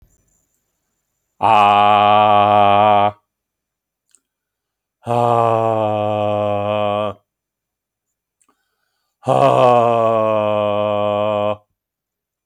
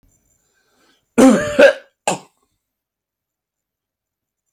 exhalation_length: 12.5 s
exhalation_amplitude: 29479
exhalation_signal_mean_std_ratio: 0.56
cough_length: 4.5 s
cough_amplitude: 28781
cough_signal_mean_std_ratio: 0.27
survey_phase: alpha (2021-03-01 to 2021-08-12)
age: 65+
gender: Male
wearing_mask: 'No'
symptom_none: true
smoker_status: Ex-smoker
respiratory_condition_asthma: false
respiratory_condition_other: false
recruitment_source: REACT
submission_delay: 3 days
covid_test_result: Negative
covid_test_method: RT-qPCR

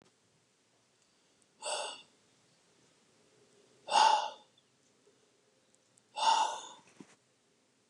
exhalation_length: 7.9 s
exhalation_amplitude: 7244
exhalation_signal_mean_std_ratio: 0.29
survey_phase: beta (2021-08-13 to 2022-03-07)
age: 45-64
gender: Male
wearing_mask: 'No'
symptom_runny_or_blocked_nose: true
symptom_sore_throat: true
symptom_fatigue: true
symptom_headache: true
symptom_change_to_sense_of_smell_or_taste: true
symptom_loss_of_taste: true
symptom_onset: 9 days
smoker_status: Ex-smoker
respiratory_condition_asthma: true
respiratory_condition_other: false
recruitment_source: Test and Trace
submission_delay: 2 days
covid_test_result: Positive
covid_test_method: RT-qPCR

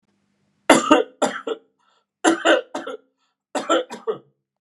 three_cough_length: 4.6 s
three_cough_amplitude: 32768
three_cough_signal_mean_std_ratio: 0.39
survey_phase: beta (2021-08-13 to 2022-03-07)
age: 45-64
gender: Male
wearing_mask: 'No'
symptom_none: true
smoker_status: Never smoked
respiratory_condition_asthma: false
respiratory_condition_other: false
recruitment_source: REACT
submission_delay: 1 day
covid_test_result: Negative
covid_test_method: RT-qPCR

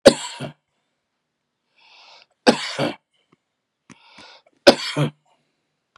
three_cough_length: 6.0 s
three_cough_amplitude: 32768
three_cough_signal_mean_std_ratio: 0.23
survey_phase: beta (2021-08-13 to 2022-03-07)
age: 45-64
gender: Male
wearing_mask: 'No'
symptom_none: true
symptom_onset: 12 days
smoker_status: Never smoked
respiratory_condition_asthma: true
respiratory_condition_other: true
recruitment_source: REACT
submission_delay: 1 day
covid_test_result: Negative
covid_test_method: RT-qPCR
influenza_a_test_result: Negative
influenza_b_test_result: Negative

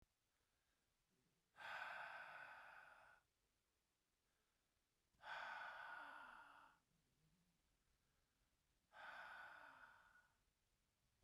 exhalation_length: 11.2 s
exhalation_amplitude: 304
exhalation_signal_mean_std_ratio: 0.51
survey_phase: beta (2021-08-13 to 2022-03-07)
age: 45-64
gender: Male
wearing_mask: 'No'
symptom_cough_any: true
symptom_shortness_of_breath: true
symptom_sore_throat: true
symptom_change_to_sense_of_smell_or_taste: true
symptom_other: true
smoker_status: Ex-smoker
respiratory_condition_asthma: false
respiratory_condition_other: false
recruitment_source: Test and Trace
submission_delay: 0 days
covid_test_result: Positive
covid_test_method: LFT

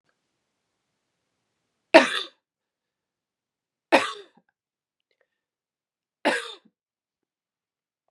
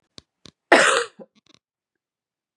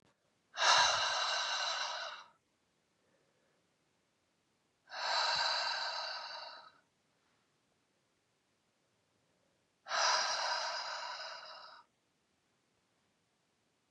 three_cough_length: 8.1 s
three_cough_amplitude: 32768
three_cough_signal_mean_std_ratio: 0.17
cough_length: 2.6 s
cough_amplitude: 31994
cough_signal_mean_std_ratio: 0.27
exhalation_length: 13.9 s
exhalation_amplitude: 5547
exhalation_signal_mean_std_ratio: 0.45
survey_phase: beta (2021-08-13 to 2022-03-07)
age: 45-64
gender: Female
wearing_mask: 'No'
symptom_cough_any: true
symptom_runny_or_blocked_nose: true
symptom_sore_throat: true
symptom_fatigue: true
symptom_change_to_sense_of_smell_or_taste: true
symptom_loss_of_taste: true
symptom_onset: 9 days
smoker_status: Never smoked
respiratory_condition_asthma: false
respiratory_condition_other: false
recruitment_source: Test and Trace
submission_delay: 2 days
covid_test_result: Positive
covid_test_method: RT-qPCR
covid_ct_value: 27.2
covid_ct_gene: N gene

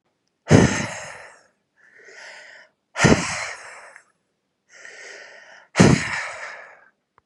exhalation_length: 7.3 s
exhalation_amplitude: 32726
exhalation_signal_mean_std_ratio: 0.33
survey_phase: beta (2021-08-13 to 2022-03-07)
age: 18-44
gender: Male
wearing_mask: 'No'
symptom_none: true
smoker_status: Never smoked
respiratory_condition_asthma: true
respiratory_condition_other: false
recruitment_source: REACT
submission_delay: 2 days
covid_test_result: Negative
covid_test_method: RT-qPCR
influenza_a_test_result: Negative
influenza_b_test_result: Negative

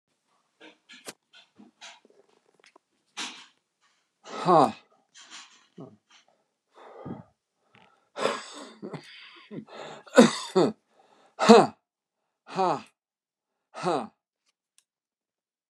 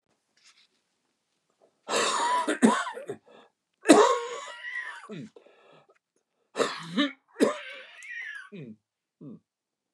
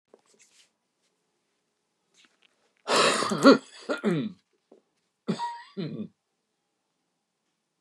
exhalation_length: 15.7 s
exhalation_amplitude: 32537
exhalation_signal_mean_std_ratio: 0.23
three_cough_length: 9.9 s
three_cough_amplitude: 27425
three_cough_signal_mean_std_ratio: 0.37
cough_length: 7.8 s
cough_amplitude: 24162
cough_signal_mean_std_ratio: 0.29
survey_phase: beta (2021-08-13 to 2022-03-07)
age: 65+
gender: Male
wearing_mask: 'No'
symptom_cough_any: true
symptom_onset: 5 days
smoker_status: Never smoked
respiratory_condition_asthma: false
respiratory_condition_other: false
recruitment_source: Test and Trace
submission_delay: 1 day
covid_test_result: Negative
covid_test_method: RT-qPCR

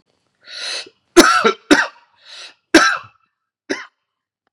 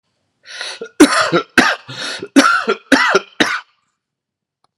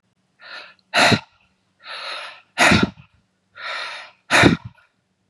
three_cough_length: 4.5 s
three_cough_amplitude: 32768
three_cough_signal_mean_std_ratio: 0.34
cough_length: 4.8 s
cough_amplitude: 32768
cough_signal_mean_std_ratio: 0.45
exhalation_length: 5.3 s
exhalation_amplitude: 30909
exhalation_signal_mean_std_ratio: 0.37
survey_phase: beta (2021-08-13 to 2022-03-07)
age: 45-64
gender: Male
wearing_mask: 'No'
symptom_cough_any: true
symptom_runny_or_blocked_nose: true
symptom_shortness_of_breath: true
symptom_headache: true
symptom_loss_of_taste: true
symptom_onset: 3 days
smoker_status: Ex-smoker
respiratory_condition_asthma: false
respiratory_condition_other: false
recruitment_source: Test and Trace
submission_delay: 2 days
covid_test_result: Positive
covid_test_method: ePCR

